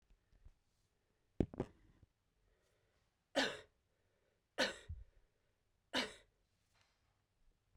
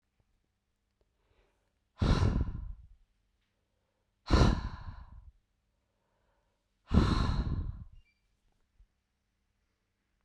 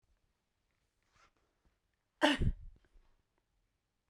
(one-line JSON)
{"three_cough_length": "7.8 s", "three_cough_amplitude": 3992, "three_cough_signal_mean_std_ratio": 0.23, "exhalation_length": "10.2 s", "exhalation_amplitude": 9325, "exhalation_signal_mean_std_ratio": 0.33, "cough_length": "4.1 s", "cough_amplitude": 5820, "cough_signal_mean_std_ratio": 0.23, "survey_phase": "beta (2021-08-13 to 2022-03-07)", "age": "18-44", "gender": "Female", "wearing_mask": "No", "symptom_cough_any": true, "symptom_runny_or_blocked_nose": true, "symptom_sore_throat": true, "symptom_fatigue": true, "symptom_fever_high_temperature": true, "symptom_headache": true, "symptom_onset": "5 days", "smoker_status": "Never smoked", "respiratory_condition_asthma": false, "respiratory_condition_other": false, "recruitment_source": "Test and Trace", "submission_delay": "2 days", "covid_test_result": "Positive", "covid_test_method": "RT-qPCR", "covid_ct_value": 34.9, "covid_ct_gene": "ORF1ab gene"}